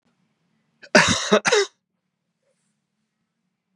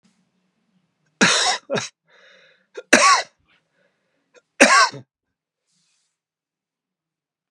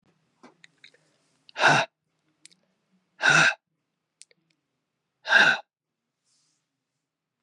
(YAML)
cough_length: 3.8 s
cough_amplitude: 32734
cough_signal_mean_std_ratio: 0.29
three_cough_length: 7.5 s
three_cough_amplitude: 32768
three_cough_signal_mean_std_ratio: 0.29
exhalation_length: 7.4 s
exhalation_amplitude: 19929
exhalation_signal_mean_std_ratio: 0.27
survey_phase: beta (2021-08-13 to 2022-03-07)
age: 65+
gender: Male
wearing_mask: 'No'
symptom_cough_any: true
symptom_runny_or_blocked_nose: true
symptom_sore_throat: true
symptom_fatigue: true
symptom_fever_high_temperature: true
symptom_other: true
symptom_onset: 6 days
smoker_status: Never smoked
respiratory_condition_asthma: false
respiratory_condition_other: false
recruitment_source: Test and Trace
submission_delay: 1 day
covid_test_result: Positive
covid_test_method: RT-qPCR
covid_ct_value: 10.5
covid_ct_gene: N gene